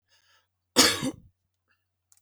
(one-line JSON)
{"cough_length": "2.2 s", "cough_amplitude": 23284, "cough_signal_mean_std_ratio": 0.27, "survey_phase": "beta (2021-08-13 to 2022-03-07)", "age": "45-64", "gender": "Male", "wearing_mask": "No", "symptom_other": true, "smoker_status": "Never smoked", "respiratory_condition_asthma": false, "respiratory_condition_other": false, "recruitment_source": "Test and Trace", "submission_delay": "2 days", "covid_test_result": "Positive", "covid_test_method": "RT-qPCR", "covid_ct_value": 18.4, "covid_ct_gene": "ORF1ab gene"}